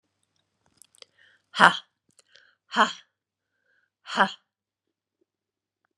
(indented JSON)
{
  "exhalation_length": "6.0 s",
  "exhalation_amplitude": 32730,
  "exhalation_signal_mean_std_ratio": 0.18,
  "survey_phase": "beta (2021-08-13 to 2022-03-07)",
  "age": "45-64",
  "gender": "Female",
  "wearing_mask": "No",
  "symptom_cough_any": true,
  "symptom_runny_or_blocked_nose": true,
  "symptom_sore_throat": true,
  "smoker_status": "Never smoked",
  "respiratory_condition_asthma": false,
  "respiratory_condition_other": false,
  "recruitment_source": "Test and Trace",
  "submission_delay": "1 day",
  "covid_test_result": "Positive",
  "covid_test_method": "LFT"
}